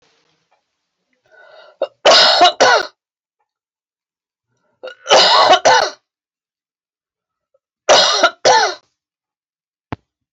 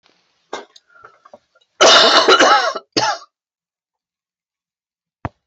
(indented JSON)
{
  "three_cough_length": "10.3 s",
  "three_cough_amplitude": 32398,
  "three_cough_signal_mean_std_ratio": 0.38,
  "cough_length": "5.5 s",
  "cough_amplitude": 32767,
  "cough_signal_mean_std_ratio": 0.37,
  "survey_phase": "beta (2021-08-13 to 2022-03-07)",
  "age": "65+",
  "gender": "Female",
  "wearing_mask": "No",
  "symptom_cough_any": true,
  "symptom_fatigue": true,
  "symptom_onset": "8 days",
  "smoker_status": "Never smoked",
  "respiratory_condition_asthma": false,
  "respiratory_condition_other": false,
  "recruitment_source": "REACT",
  "submission_delay": "1 day",
  "covid_test_result": "Negative",
  "covid_test_method": "RT-qPCR"
}